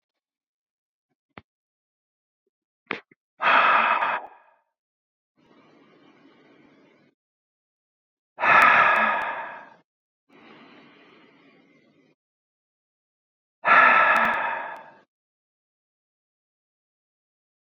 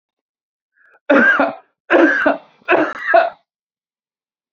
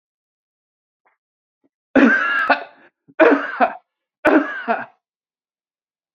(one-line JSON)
{"exhalation_length": "17.7 s", "exhalation_amplitude": 21149, "exhalation_signal_mean_std_ratio": 0.31, "cough_length": "4.5 s", "cough_amplitude": 28330, "cough_signal_mean_std_ratio": 0.46, "three_cough_length": "6.1 s", "three_cough_amplitude": 31474, "three_cough_signal_mean_std_ratio": 0.38, "survey_phase": "alpha (2021-03-01 to 2021-08-12)", "age": "45-64", "gender": "Male", "wearing_mask": "No", "symptom_none": true, "smoker_status": "Ex-smoker", "respiratory_condition_asthma": false, "respiratory_condition_other": false, "recruitment_source": "REACT", "submission_delay": "1 day", "covid_test_result": "Negative", "covid_test_method": "RT-qPCR"}